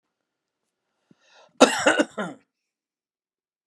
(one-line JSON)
{"cough_length": "3.7 s", "cough_amplitude": 32767, "cough_signal_mean_std_ratio": 0.24, "survey_phase": "beta (2021-08-13 to 2022-03-07)", "age": "65+", "gender": "Male", "wearing_mask": "No", "symptom_none": true, "smoker_status": "Never smoked", "respiratory_condition_asthma": false, "respiratory_condition_other": false, "recruitment_source": "REACT", "submission_delay": "2 days", "covid_test_result": "Negative", "covid_test_method": "RT-qPCR", "influenza_a_test_result": "Negative", "influenza_b_test_result": "Negative"}